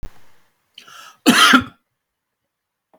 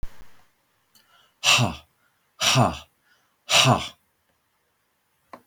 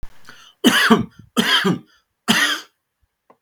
cough_length: 3.0 s
cough_amplitude: 32768
cough_signal_mean_std_ratio: 0.31
exhalation_length: 5.5 s
exhalation_amplitude: 31416
exhalation_signal_mean_std_ratio: 0.35
three_cough_length: 3.4 s
three_cough_amplitude: 32768
three_cough_signal_mean_std_ratio: 0.48
survey_phase: beta (2021-08-13 to 2022-03-07)
age: 45-64
gender: Male
wearing_mask: 'No'
symptom_none: true
smoker_status: Ex-smoker
respiratory_condition_asthma: false
respiratory_condition_other: false
recruitment_source: REACT
submission_delay: 1 day
covid_test_result: Negative
covid_test_method: RT-qPCR
influenza_a_test_result: Negative
influenza_b_test_result: Negative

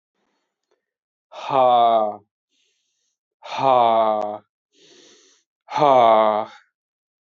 exhalation_length: 7.3 s
exhalation_amplitude: 25550
exhalation_signal_mean_std_ratio: 0.44
survey_phase: alpha (2021-03-01 to 2021-08-12)
age: 18-44
gender: Male
wearing_mask: 'No'
symptom_cough_any: true
symptom_fatigue: true
symptom_headache: true
symptom_change_to_sense_of_smell_or_taste: true
symptom_onset: 4 days
smoker_status: Never smoked
respiratory_condition_asthma: false
respiratory_condition_other: false
recruitment_source: Test and Trace
submission_delay: 1 day
covid_test_result: Positive
covid_test_method: RT-qPCR
covid_ct_value: 15.0
covid_ct_gene: ORF1ab gene
covid_ct_mean: 15.4
covid_viral_load: 8700000 copies/ml
covid_viral_load_category: High viral load (>1M copies/ml)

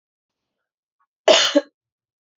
cough_length: 2.4 s
cough_amplitude: 29972
cough_signal_mean_std_ratio: 0.27
survey_phase: beta (2021-08-13 to 2022-03-07)
age: 18-44
gender: Female
wearing_mask: 'No'
symptom_cough_any: true
symptom_runny_or_blocked_nose: true
symptom_other: true
symptom_onset: 5 days
smoker_status: Never smoked
respiratory_condition_asthma: true
respiratory_condition_other: false
recruitment_source: Test and Trace
submission_delay: 2 days
covid_test_result: Negative
covid_test_method: RT-qPCR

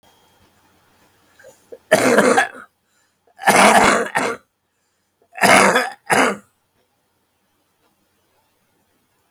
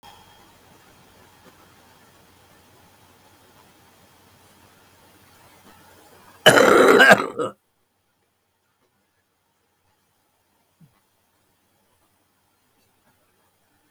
three_cough_length: 9.3 s
three_cough_amplitude: 32768
three_cough_signal_mean_std_ratio: 0.38
cough_length: 13.9 s
cough_amplitude: 32768
cough_signal_mean_std_ratio: 0.21
survey_phase: beta (2021-08-13 to 2022-03-07)
age: 65+
gender: Male
wearing_mask: 'No'
symptom_cough_any: true
symptom_runny_or_blocked_nose: true
smoker_status: Ex-smoker
respiratory_condition_asthma: false
respiratory_condition_other: false
recruitment_source: REACT
submission_delay: 4 days
covid_test_result: Negative
covid_test_method: RT-qPCR
influenza_a_test_result: Negative
influenza_b_test_result: Negative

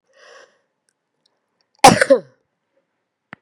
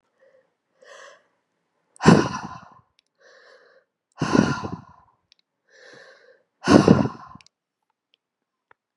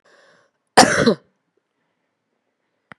three_cough_length: 3.4 s
three_cough_amplitude: 32768
three_cough_signal_mean_std_ratio: 0.21
exhalation_length: 9.0 s
exhalation_amplitude: 32767
exhalation_signal_mean_std_ratio: 0.25
cough_length: 3.0 s
cough_amplitude: 32768
cough_signal_mean_std_ratio: 0.25
survey_phase: beta (2021-08-13 to 2022-03-07)
age: 65+
gender: Female
wearing_mask: 'No'
symptom_cough_any: true
symptom_runny_or_blocked_nose: true
symptom_sore_throat: true
symptom_headache: true
symptom_onset: 4 days
smoker_status: Ex-smoker
respiratory_condition_asthma: false
respiratory_condition_other: false
recruitment_source: REACT
submission_delay: 2 days
covid_test_result: Negative
covid_test_method: RT-qPCR
influenza_a_test_result: Negative
influenza_b_test_result: Negative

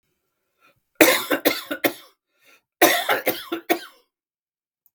cough_length: 4.9 s
cough_amplitude: 32768
cough_signal_mean_std_ratio: 0.36
survey_phase: beta (2021-08-13 to 2022-03-07)
age: 45-64
gender: Male
wearing_mask: 'No'
symptom_none: true
smoker_status: Ex-smoker
respiratory_condition_asthma: true
respiratory_condition_other: false
recruitment_source: REACT
submission_delay: 2 days
covid_test_result: Negative
covid_test_method: RT-qPCR
influenza_a_test_result: Negative
influenza_b_test_result: Negative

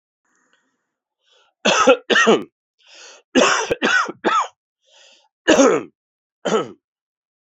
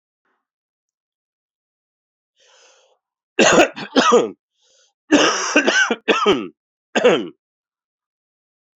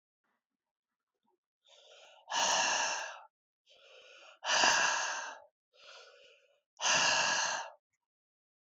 three_cough_length: 7.5 s
three_cough_amplitude: 30350
three_cough_signal_mean_std_ratio: 0.42
cough_length: 8.8 s
cough_amplitude: 29080
cough_signal_mean_std_ratio: 0.38
exhalation_length: 8.6 s
exhalation_amplitude: 9132
exhalation_signal_mean_std_ratio: 0.46
survey_phase: alpha (2021-03-01 to 2021-08-12)
age: 45-64
gender: Male
wearing_mask: 'No'
symptom_cough_any: true
symptom_fatigue: true
symptom_change_to_sense_of_smell_or_taste: true
symptom_loss_of_taste: true
smoker_status: Ex-smoker
respiratory_condition_asthma: false
respiratory_condition_other: false
recruitment_source: Test and Trace
submission_delay: 1 day
covid_test_result: Positive
covid_test_method: RT-qPCR
covid_ct_value: 12.6
covid_ct_gene: S gene
covid_ct_mean: 13.1
covid_viral_load: 49000000 copies/ml
covid_viral_load_category: High viral load (>1M copies/ml)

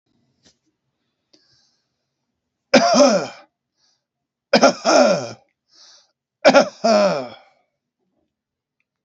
three_cough_length: 9.0 s
three_cough_amplitude: 30950
three_cough_signal_mean_std_ratio: 0.35
survey_phase: alpha (2021-03-01 to 2021-08-12)
age: 65+
gender: Male
wearing_mask: 'No'
symptom_none: true
smoker_status: Current smoker (11 or more cigarettes per day)
respiratory_condition_asthma: false
respiratory_condition_other: false
recruitment_source: REACT
submission_delay: 3 days
covid_test_method: RT-qPCR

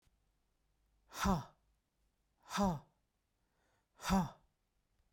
exhalation_length: 5.1 s
exhalation_amplitude: 2780
exhalation_signal_mean_std_ratio: 0.32
survey_phase: beta (2021-08-13 to 2022-03-07)
age: 45-64
gender: Female
wearing_mask: 'No'
symptom_none: true
smoker_status: Ex-smoker
respiratory_condition_asthma: false
respiratory_condition_other: false
recruitment_source: REACT
submission_delay: 2 days
covid_test_result: Negative
covid_test_method: RT-qPCR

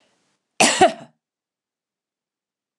cough_length: 2.8 s
cough_amplitude: 29010
cough_signal_mean_std_ratio: 0.25
survey_phase: beta (2021-08-13 to 2022-03-07)
age: 65+
gender: Female
wearing_mask: 'No'
symptom_none: true
smoker_status: Never smoked
respiratory_condition_asthma: false
respiratory_condition_other: false
recruitment_source: REACT
submission_delay: 1 day
covid_test_result: Negative
covid_test_method: RT-qPCR
influenza_a_test_result: Negative
influenza_b_test_result: Negative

